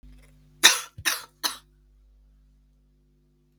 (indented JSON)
{
  "three_cough_length": "3.6 s",
  "three_cough_amplitude": 32768,
  "three_cough_signal_mean_std_ratio": 0.23,
  "survey_phase": "beta (2021-08-13 to 2022-03-07)",
  "age": "18-44",
  "gender": "Female",
  "wearing_mask": "Yes",
  "symptom_cough_any": true,
  "symptom_runny_or_blocked_nose": true,
  "symptom_sore_throat": true,
  "symptom_diarrhoea": true,
  "symptom_fatigue": true,
  "symptom_headache": true,
  "symptom_other": true,
  "symptom_onset": "4 days",
  "smoker_status": "Never smoked",
  "respiratory_condition_asthma": false,
  "respiratory_condition_other": false,
  "recruitment_source": "Test and Trace",
  "submission_delay": "1 day",
  "covid_test_result": "Positive",
  "covid_test_method": "RT-qPCR",
  "covid_ct_value": 17.1,
  "covid_ct_gene": "ORF1ab gene",
  "covid_ct_mean": 17.5,
  "covid_viral_load": "1800000 copies/ml",
  "covid_viral_load_category": "High viral load (>1M copies/ml)"
}